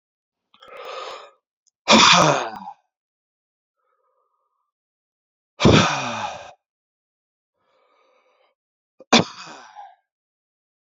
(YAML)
exhalation_length: 10.8 s
exhalation_amplitude: 30079
exhalation_signal_mean_std_ratio: 0.28
survey_phase: beta (2021-08-13 to 2022-03-07)
age: 18-44
gender: Male
wearing_mask: 'No'
symptom_runny_or_blocked_nose: true
symptom_other: true
smoker_status: Ex-smoker
respiratory_condition_asthma: false
respiratory_condition_other: false
recruitment_source: Test and Trace
submission_delay: 1 day
covid_test_result: Positive
covid_test_method: RT-qPCR
covid_ct_value: 29.5
covid_ct_gene: ORF1ab gene